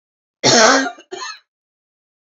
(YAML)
cough_length: 2.3 s
cough_amplitude: 32767
cough_signal_mean_std_ratio: 0.39
survey_phase: beta (2021-08-13 to 2022-03-07)
age: 45-64
gender: Female
wearing_mask: 'No'
symptom_cough_any: true
symptom_runny_or_blocked_nose: true
symptom_fatigue: true
symptom_headache: true
symptom_onset: 2 days
smoker_status: Current smoker (e-cigarettes or vapes only)
respiratory_condition_asthma: false
respiratory_condition_other: false
recruitment_source: Test and Trace
submission_delay: 2 days
covid_test_result: Positive
covid_test_method: ePCR